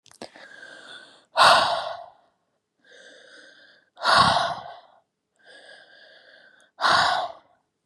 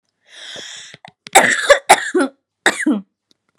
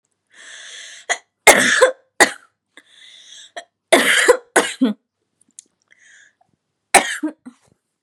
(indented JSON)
{
  "exhalation_length": "7.9 s",
  "exhalation_amplitude": 23587,
  "exhalation_signal_mean_std_ratio": 0.37,
  "cough_length": "3.6 s",
  "cough_amplitude": 32768,
  "cough_signal_mean_std_ratio": 0.4,
  "three_cough_length": "8.0 s",
  "three_cough_amplitude": 32768,
  "three_cough_signal_mean_std_ratio": 0.33,
  "survey_phase": "beta (2021-08-13 to 2022-03-07)",
  "age": "18-44",
  "gender": "Female",
  "wearing_mask": "No",
  "symptom_cough_any": true,
  "symptom_headache": true,
  "symptom_onset": "12 days",
  "smoker_status": "Never smoked",
  "respiratory_condition_asthma": false,
  "respiratory_condition_other": false,
  "recruitment_source": "REACT",
  "submission_delay": "4 days",
  "covid_test_result": "Negative",
  "covid_test_method": "RT-qPCR",
  "influenza_a_test_result": "Negative",
  "influenza_b_test_result": "Negative"
}